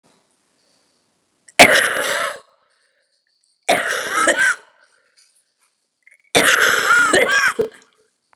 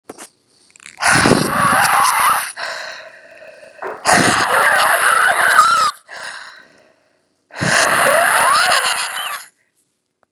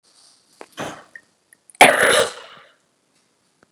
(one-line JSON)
{"three_cough_length": "8.4 s", "three_cough_amplitude": 32768, "three_cough_signal_mean_std_ratio": 0.44, "exhalation_length": "10.3 s", "exhalation_amplitude": 32768, "exhalation_signal_mean_std_ratio": 0.65, "cough_length": "3.7 s", "cough_amplitude": 32768, "cough_signal_mean_std_ratio": 0.28, "survey_phase": "beta (2021-08-13 to 2022-03-07)", "age": "18-44", "gender": "Female", "wearing_mask": "No", "symptom_cough_any": true, "symptom_new_continuous_cough": true, "symptom_runny_or_blocked_nose": true, "symptom_shortness_of_breath": true, "symptom_sore_throat": true, "symptom_onset": "4 days", "smoker_status": "Ex-smoker", "respiratory_condition_asthma": false, "respiratory_condition_other": false, "recruitment_source": "Test and Trace", "submission_delay": "2 days", "covid_test_result": "Positive", "covid_test_method": "ePCR"}